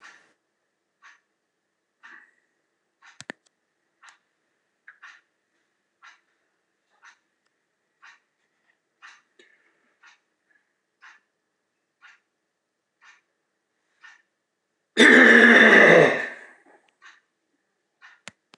{"cough_length": "18.6 s", "cough_amplitude": 26027, "cough_signal_mean_std_ratio": 0.22, "survey_phase": "beta (2021-08-13 to 2022-03-07)", "age": "65+", "gender": "Male", "wearing_mask": "No", "symptom_cough_any": true, "symptom_sore_throat": true, "symptom_onset": "6 days", "smoker_status": "Never smoked", "respiratory_condition_asthma": false, "respiratory_condition_other": false, "recruitment_source": "Test and Trace", "submission_delay": "1 day", "covid_test_result": "Positive", "covid_test_method": "RT-qPCR", "covid_ct_value": 21.0, "covid_ct_gene": "ORF1ab gene", "covid_ct_mean": 21.7, "covid_viral_load": "79000 copies/ml", "covid_viral_load_category": "Low viral load (10K-1M copies/ml)"}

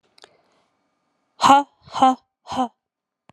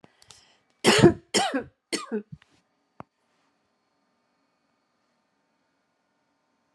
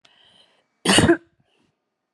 {"exhalation_length": "3.3 s", "exhalation_amplitude": 31259, "exhalation_signal_mean_std_ratio": 0.29, "three_cough_length": "6.7 s", "three_cough_amplitude": 26086, "three_cough_signal_mean_std_ratio": 0.23, "cough_length": "2.1 s", "cough_amplitude": 32037, "cough_signal_mean_std_ratio": 0.31, "survey_phase": "alpha (2021-03-01 to 2021-08-12)", "age": "45-64", "gender": "Female", "wearing_mask": "No", "symptom_none": true, "smoker_status": "Ex-smoker", "respiratory_condition_asthma": false, "respiratory_condition_other": false, "recruitment_source": "REACT", "submission_delay": "2 days", "covid_test_result": "Negative", "covid_test_method": "RT-qPCR"}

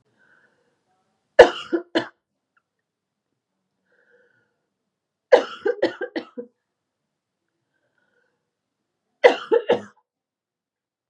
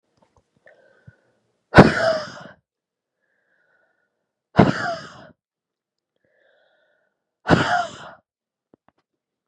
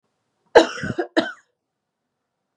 {"three_cough_length": "11.1 s", "three_cough_amplitude": 32768, "three_cough_signal_mean_std_ratio": 0.2, "exhalation_length": "9.5 s", "exhalation_amplitude": 32768, "exhalation_signal_mean_std_ratio": 0.23, "cough_length": "2.6 s", "cough_amplitude": 32768, "cough_signal_mean_std_ratio": 0.25, "survey_phase": "beta (2021-08-13 to 2022-03-07)", "age": "18-44", "gender": "Female", "wearing_mask": "No", "symptom_cough_any": true, "symptom_runny_or_blocked_nose": true, "symptom_sore_throat": true, "symptom_fatigue": true, "symptom_onset": "4 days", "smoker_status": "Current smoker (1 to 10 cigarettes per day)", "respiratory_condition_asthma": true, "respiratory_condition_other": false, "recruitment_source": "Test and Trace", "submission_delay": "1 day", "covid_test_result": "Negative", "covid_test_method": "RT-qPCR"}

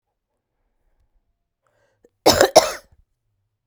{"cough_length": "3.7 s", "cough_amplitude": 32768, "cough_signal_mean_std_ratio": 0.22, "survey_phase": "beta (2021-08-13 to 2022-03-07)", "age": "45-64", "gender": "Female", "wearing_mask": "No", "symptom_cough_any": true, "symptom_runny_or_blocked_nose": true, "symptom_shortness_of_breath": true, "symptom_diarrhoea": true, "symptom_fever_high_temperature": true, "symptom_change_to_sense_of_smell_or_taste": true, "symptom_loss_of_taste": true, "symptom_onset": "4 days", "smoker_status": "Ex-smoker", "respiratory_condition_asthma": false, "respiratory_condition_other": false, "recruitment_source": "Test and Trace", "submission_delay": "3 days", "covid_test_result": "Positive", "covid_test_method": "ePCR"}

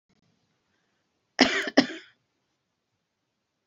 {"cough_length": "3.7 s", "cough_amplitude": 25520, "cough_signal_mean_std_ratio": 0.21, "survey_phase": "alpha (2021-03-01 to 2021-08-12)", "age": "65+", "gender": "Female", "wearing_mask": "No", "symptom_none": true, "smoker_status": "Never smoked", "respiratory_condition_asthma": false, "respiratory_condition_other": false, "recruitment_source": "REACT", "submission_delay": "1 day", "covid_test_result": "Negative", "covid_test_method": "RT-qPCR"}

